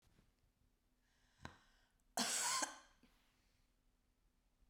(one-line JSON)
{"cough_length": "4.7 s", "cough_amplitude": 1912, "cough_signal_mean_std_ratio": 0.31, "survey_phase": "beta (2021-08-13 to 2022-03-07)", "age": "45-64", "gender": "Female", "wearing_mask": "No", "symptom_cough_any": true, "symptom_runny_or_blocked_nose": true, "symptom_sore_throat": true, "symptom_diarrhoea": true, "symptom_fatigue": true, "symptom_fever_high_temperature": true, "symptom_headache": true, "symptom_other": true, "symptom_onset": "1 day", "smoker_status": "Never smoked", "respiratory_condition_asthma": false, "respiratory_condition_other": false, "recruitment_source": "Test and Trace", "submission_delay": "1 day", "covid_test_result": "Positive", "covid_test_method": "RT-qPCR", "covid_ct_value": 23.9, "covid_ct_gene": "ORF1ab gene"}